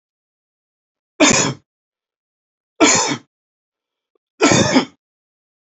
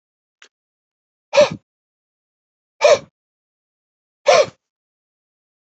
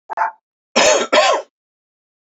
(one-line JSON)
{"three_cough_length": "5.7 s", "three_cough_amplitude": 28642, "three_cough_signal_mean_std_ratio": 0.35, "exhalation_length": "5.6 s", "exhalation_amplitude": 30617, "exhalation_signal_mean_std_ratio": 0.24, "cough_length": "2.2 s", "cough_amplitude": 29621, "cough_signal_mean_std_ratio": 0.48, "survey_phase": "beta (2021-08-13 to 2022-03-07)", "age": "45-64", "gender": "Male", "wearing_mask": "No", "symptom_none": true, "smoker_status": "Never smoked", "respiratory_condition_asthma": false, "respiratory_condition_other": false, "recruitment_source": "REACT", "submission_delay": "1 day", "covid_test_result": "Negative", "covid_test_method": "RT-qPCR", "influenza_a_test_result": "Unknown/Void", "influenza_b_test_result": "Unknown/Void"}